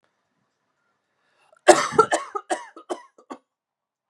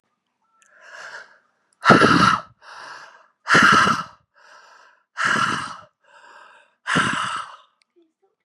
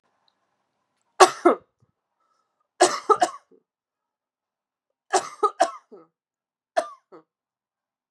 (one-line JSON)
{"cough_length": "4.1 s", "cough_amplitude": 32768, "cough_signal_mean_std_ratio": 0.24, "exhalation_length": "8.4 s", "exhalation_amplitude": 32767, "exhalation_signal_mean_std_ratio": 0.4, "three_cough_length": "8.1 s", "three_cough_amplitude": 32767, "three_cough_signal_mean_std_ratio": 0.22, "survey_phase": "beta (2021-08-13 to 2022-03-07)", "age": "18-44", "gender": "Female", "wearing_mask": "No", "symptom_cough_any": true, "symptom_new_continuous_cough": true, "symptom_runny_or_blocked_nose": true, "symptom_sore_throat": true, "symptom_fatigue": true, "symptom_fever_high_temperature": true, "symptom_headache": true, "symptom_change_to_sense_of_smell_or_taste": true, "symptom_loss_of_taste": true, "smoker_status": "Never smoked", "respiratory_condition_asthma": false, "respiratory_condition_other": false, "recruitment_source": "Test and Trace", "submission_delay": "-1 day", "covid_test_result": "Positive", "covid_test_method": "RT-qPCR", "covid_ct_value": 20.1, "covid_ct_gene": "ORF1ab gene"}